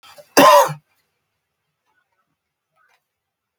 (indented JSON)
{
  "cough_length": "3.6 s",
  "cough_amplitude": 32768,
  "cough_signal_mean_std_ratio": 0.25,
  "survey_phase": "beta (2021-08-13 to 2022-03-07)",
  "age": "65+",
  "gender": "Male",
  "wearing_mask": "No",
  "symptom_cough_any": true,
  "symptom_runny_or_blocked_nose": true,
  "symptom_fatigue": true,
  "smoker_status": "Never smoked",
  "respiratory_condition_asthma": false,
  "respiratory_condition_other": false,
  "recruitment_source": "REACT",
  "submission_delay": "2 days",
  "covid_test_result": "Negative",
  "covid_test_method": "RT-qPCR",
  "influenza_a_test_result": "Negative",
  "influenza_b_test_result": "Negative"
}